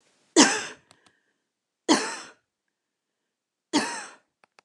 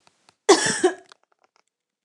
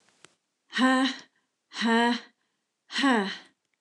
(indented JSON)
{
  "three_cough_length": "4.6 s",
  "three_cough_amplitude": 27169,
  "three_cough_signal_mean_std_ratio": 0.28,
  "cough_length": "2.0 s",
  "cough_amplitude": 28345,
  "cough_signal_mean_std_ratio": 0.31,
  "exhalation_length": "3.8 s",
  "exhalation_amplitude": 10257,
  "exhalation_signal_mean_std_ratio": 0.47,
  "survey_phase": "beta (2021-08-13 to 2022-03-07)",
  "age": "45-64",
  "gender": "Female",
  "wearing_mask": "No",
  "symptom_none": true,
  "smoker_status": "Never smoked",
  "respiratory_condition_asthma": false,
  "respiratory_condition_other": false,
  "recruitment_source": "REACT",
  "submission_delay": "0 days",
  "covid_test_result": "Negative",
  "covid_test_method": "RT-qPCR"
}